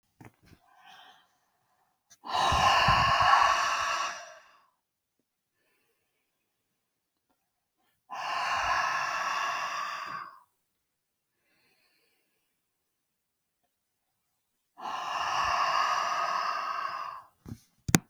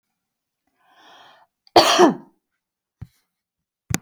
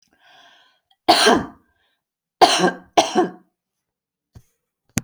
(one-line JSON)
{"exhalation_length": "18.1 s", "exhalation_amplitude": 32767, "exhalation_signal_mean_std_ratio": 0.46, "cough_length": "4.0 s", "cough_amplitude": 32767, "cough_signal_mean_std_ratio": 0.25, "three_cough_length": "5.0 s", "three_cough_amplitude": 32768, "three_cough_signal_mean_std_ratio": 0.33, "survey_phase": "beta (2021-08-13 to 2022-03-07)", "age": "45-64", "gender": "Female", "wearing_mask": "No", "symptom_change_to_sense_of_smell_or_taste": true, "smoker_status": "Never smoked", "respiratory_condition_asthma": false, "respiratory_condition_other": false, "recruitment_source": "REACT", "submission_delay": "5 days", "covid_test_result": "Negative", "covid_test_method": "RT-qPCR"}